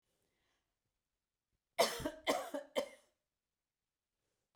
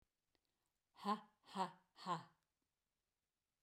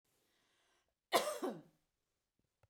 {"three_cough_length": "4.6 s", "three_cough_amplitude": 4756, "three_cough_signal_mean_std_ratio": 0.28, "exhalation_length": "3.6 s", "exhalation_amplitude": 1199, "exhalation_signal_mean_std_ratio": 0.29, "cough_length": "2.7 s", "cough_amplitude": 4356, "cough_signal_mean_std_ratio": 0.27, "survey_phase": "beta (2021-08-13 to 2022-03-07)", "age": "45-64", "gender": "Female", "wearing_mask": "No", "symptom_none": true, "smoker_status": "Never smoked", "respiratory_condition_asthma": false, "respiratory_condition_other": false, "recruitment_source": "REACT", "submission_delay": "1 day", "covid_test_result": "Negative", "covid_test_method": "RT-qPCR"}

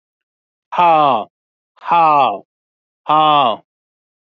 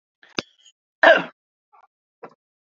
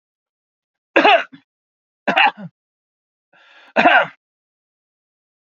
{"exhalation_length": "4.4 s", "exhalation_amplitude": 32768, "exhalation_signal_mean_std_ratio": 0.47, "cough_length": "2.7 s", "cough_amplitude": 28922, "cough_signal_mean_std_ratio": 0.21, "three_cough_length": "5.5 s", "three_cough_amplitude": 32768, "three_cough_signal_mean_std_ratio": 0.3, "survey_phase": "beta (2021-08-13 to 2022-03-07)", "age": "45-64", "gender": "Male", "wearing_mask": "No", "symptom_none": true, "smoker_status": "Never smoked", "respiratory_condition_asthma": false, "respiratory_condition_other": false, "recruitment_source": "Test and Trace", "submission_delay": "1 day", "covid_test_result": "Negative", "covid_test_method": "RT-qPCR"}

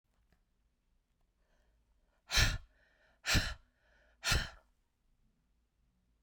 {"exhalation_length": "6.2 s", "exhalation_amplitude": 6273, "exhalation_signal_mean_std_ratio": 0.28, "survey_phase": "beta (2021-08-13 to 2022-03-07)", "age": "45-64", "gender": "Female", "wearing_mask": "No", "symptom_runny_or_blocked_nose": true, "symptom_onset": "9 days", "smoker_status": "Never smoked", "respiratory_condition_asthma": false, "respiratory_condition_other": false, "recruitment_source": "REACT", "submission_delay": "2 days", "covid_test_result": "Negative", "covid_test_method": "RT-qPCR"}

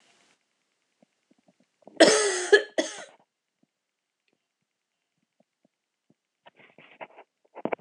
{"cough_length": "7.8 s", "cough_amplitude": 23663, "cough_signal_mean_std_ratio": 0.21, "survey_phase": "alpha (2021-03-01 to 2021-08-12)", "age": "45-64", "gender": "Female", "wearing_mask": "No", "symptom_cough_any": true, "symptom_fatigue": true, "symptom_headache": true, "symptom_onset": "4 days", "smoker_status": "Ex-smoker", "respiratory_condition_asthma": false, "respiratory_condition_other": false, "recruitment_source": "Test and Trace", "submission_delay": "2 days", "covid_test_result": "Positive", "covid_test_method": "RT-qPCR", "covid_ct_value": 23.2, "covid_ct_gene": "ORF1ab gene"}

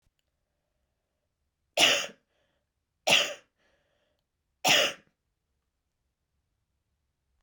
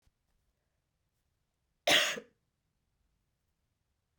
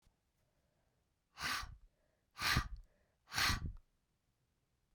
{"three_cough_length": "7.4 s", "three_cough_amplitude": 15965, "three_cough_signal_mean_std_ratio": 0.25, "cough_length": "4.2 s", "cough_amplitude": 7502, "cough_signal_mean_std_ratio": 0.2, "exhalation_length": "4.9 s", "exhalation_amplitude": 3271, "exhalation_signal_mean_std_ratio": 0.36, "survey_phase": "beta (2021-08-13 to 2022-03-07)", "age": "45-64", "gender": "Female", "wearing_mask": "No", "symptom_cough_any": true, "symptom_runny_or_blocked_nose": true, "smoker_status": "Never smoked", "respiratory_condition_asthma": false, "respiratory_condition_other": false, "recruitment_source": "Test and Trace", "submission_delay": "2 days", "covid_test_result": "Positive", "covid_test_method": "RT-qPCR", "covid_ct_value": 15.8, "covid_ct_gene": "N gene", "covid_ct_mean": 17.6, "covid_viral_load": "1700000 copies/ml", "covid_viral_load_category": "High viral load (>1M copies/ml)"}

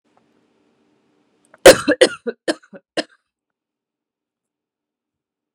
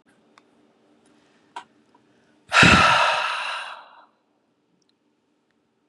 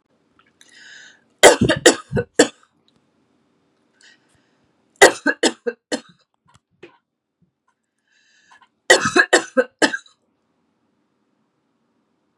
{"cough_length": "5.5 s", "cough_amplitude": 32768, "cough_signal_mean_std_ratio": 0.18, "exhalation_length": "5.9 s", "exhalation_amplitude": 32753, "exhalation_signal_mean_std_ratio": 0.32, "three_cough_length": "12.4 s", "three_cough_amplitude": 32768, "three_cough_signal_mean_std_ratio": 0.24, "survey_phase": "beta (2021-08-13 to 2022-03-07)", "age": "45-64", "gender": "Female", "wearing_mask": "No", "symptom_none": true, "smoker_status": "Never smoked", "respiratory_condition_asthma": false, "respiratory_condition_other": false, "recruitment_source": "Test and Trace", "submission_delay": "3 days", "covid_test_result": "Negative", "covid_test_method": "RT-qPCR"}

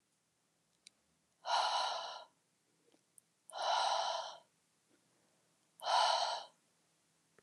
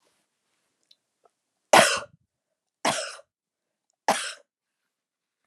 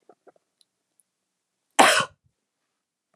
{"exhalation_length": "7.4 s", "exhalation_amplitude": 3359, "exhalation_signal_mean_std_ratio": 0.43, "three_cough_length": "5.5 s", "three_cough_amplitude": 28070, "three_cough_signal_mean_std_ratio": 0.23, "cough_length": "3.2 s", "cough_amplitude": 32767, "cough_signal_mean_std_ratio": 0.21, "survey_phase": "beta (2021-08-13 to 2022-03-07)", "age": "45-64", "gender": "Female", "wearing_mask": "No", "symptom_none": true, "smoker_status": "Never smoked", "respiratory_condition_asthma": false, "respiratory_condition_other": false, "recruitment_source": "REACT", "submission_delay": "8 days", "covid_test_result": "Negative", "covid_test_method": "RT-qPCR", "influenza_a_test_result": "Unknown/Void", "influenza_b_test_result": "Unknown/Void"}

